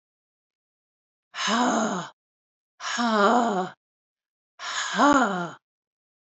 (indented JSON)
{
  "exhalation_length": "6.2 s",
  "exhalation_amplitude": 15368,
  "exhalation_signal_mean_std_ratio": 0.49,
  "survey_phase": "alpha (2021-03-01 to 2021-08-12)",
  "age": "45-64",
  "gender": "Female",
  "wearing_mask": "No",
  "symptom_cough_any": true,
  "smoker_status": "Never smoked",
  "respiratory_condition_asthma": false,
  "respiratory_condition_other": false,
  "recruitment_source": "Test and Trace",
  "submission_delay": "2 days",
  "covid_test_result": "Positive",
  "covid_test_method": "RT-qPCR",
  "covid_ct_value": 19.9,
  "covid_ct_gene": "ORF1ab gene",
  "covid_ct_mean": 20.8,
  "covid_viral_load": "150000 copies/ml",
  "covid_viral_load_category": "Low viral load (10K-1M copies/ml)"
}